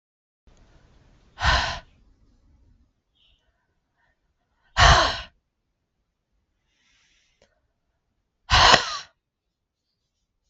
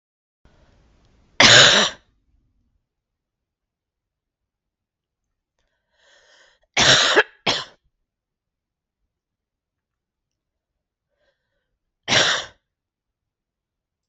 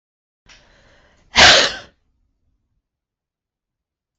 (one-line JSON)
{"exhalation_length": "10.5 s", "exhalation_amplitude": 32768, "exhalation_signal_mean_std_ratio": 0.25, "three_cough_length": "14.1 s", "three_cough_amplitude": 32768, "three_cough_signal_mean_std_ratio": 0.24, "cough_length": "4.2 s", "cough_amplitude": 32768, "cough_signal_mean_std_ratio": 0.24, "survey_phase": "beta (2021-08-13 to 2022-03-07)", "age": "45-64", "gender": "Female", "wearing_mask": "No", "symptom_cough_any": true, "symptom_runny_or_blocked_nose": true, "symptom_shortness_of_breath": true, "symptom_sore_throat": true, "symptom_abdominal_pain": true, "symptom_diarrhoea": true, "symptom_fatigue": true, "symptom_fever_high_temperature": true, "symptom_headache": true, "symptom_loss_of_taste": true, "symptom_other": true, "symptom_onset": "8 days", "smoker_status": "Current smoker (1 to 10 cigarettes per day)", "respiratory_condition_asthma": true, "respiratory_condition_other": false, "recruitment_source": "Test and Trace", "submission_delay": "2 days", "covid_test_result": "Positive", "covid_test_method": "LAMP"}